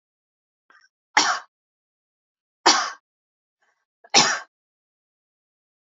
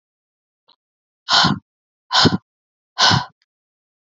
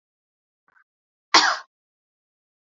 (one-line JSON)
{"three_cough_length": "5.9 s", "three_cough_amplitude": 28506, "three_cough_signal_mean_std_ratio": 0.25, "exhalation_length": "4.0 s", "exhalation_amplitude": 29953, "exhalation_signal_mean_std_ratio": 0.34, "cough_length": "2.7 s", "cough_amplitude": 29028, "cough_signal_mean_std_ratio": 0.2, "survey_phase": "beta (2021-08-13 to 2022-03-07)", "age": "18-44", "gender": "Female", "wearing_mask": "No", "symptom_change_to_sense_of_smell_or_taste": true, "symptom_loss_of_taste": true, "smoker_status": "Never smoked", "respiratory_condition_asthma": false, "respiratory_condition_other": false, "recruitment_source": "Test and Trace", "submission_delay": "10 days", "covid_test_result": "Positive", "covid_test_method": "RT-qPCR", "covid_ct_value": 18.1, "covid_ct_gene": "N gene", "covid_ct_mean": 19.6, "covid_viral_load": "380000 copies/ml", "covid_viral_load_category": "Low viral load (10K-1M copies/ml)"}